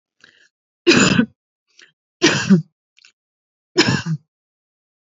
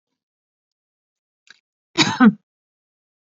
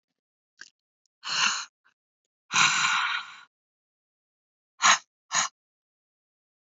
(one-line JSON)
{"three_cough_length": "5.1 s", "three_cough_amplitude": 30502, "three_cough_signal_mean_std_ratio": 0.36, "cough_length": "3.3 s", "cough_amplitude": 28167, "cough_signal_mean_std_ratio": 0.22, "exhalation_length": "6.7 s", "exhalation_amplitude": 17519, "exhalation_signal_mean_std_ratio": 0.34, "survey_phase": "beta (2021-08-13 to 2022-03-07)", "age": "65+", "gender": "Female", "wearing_mask": "No", "symptom_none": true, "smoker_status": "Ex-smoker", "respiratory_condition_asthma": false, "respiratory_condition_other": false, "recruitment_source": "REACT", "submission_delay": "1 day", "covid_test_result": "Negative", "covid_test_method": "RT-qPCR", "influenza_a_test_result": "Negative", "influenza_b_test_result": "Negative"}